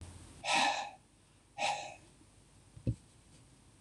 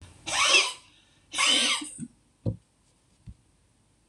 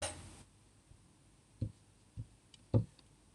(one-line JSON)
{"exhalation_length": "3.8 s", "exhalation_amplitude": 4225, "exhalation_signal_mean_std_ratio": 0.43, "three_cough_length": "4.1 s", "three_cough_amplitude": 15861, "three_cough_signal_mean_std_ratio": 0.43, "cough_length": "3.3 s", "cough_amplitude": 4960, "cough_signal_mean_std_ratio": 0.28, "survey_phase": "beta (2021-08-13 to 2022-03-07)", "age": "65+", "gender": "Male", "wearing_mask": "No", "symptom_none": true, "smoker_status": "Never smoked", "respiratory_condition_asthma": false, "respiratory_condition_other": false, "recruitment_source": "REACT", "submission_delay": "3 days", "covid_test_result": "Negative", "covid_test_method": "RT-qPCR"}